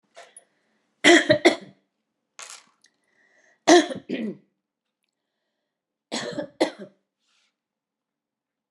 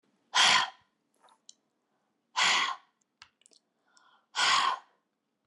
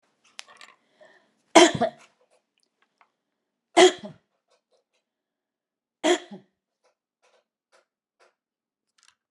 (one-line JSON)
{"three_cough_length": "8.7 s", "three_cough_amplitude": 28741, "three_cough_signal_mean_std_ratio": 0.25, "exhalation_length": "5.5 s", "exhalation_amplitude": 10127, "exhalation_signal_mean_std_ratio": 0.37, "cough_length": "9.3 s", "cough_amplitude": 32538, "cough_signal_mean_std_ratio": 0.18, "survey_phase": "beta (2021-08-13 to 2022-03-07)", "age": "65+", "gender": "Female", "wearing_mask": "No", "symptom_none": true, "smoker_status": "Ex-smoker", "respiratory_condition_asthma": false, "respiratory_condition_other": false, "recruitment_source": "REACT", "submission_delay": "1 day", "covid_test_result": "Negative", "covid_test_method": "RT-qPCR", "influenza_a_test_result": "Negative", "influenza_b_test_result": "Negative"}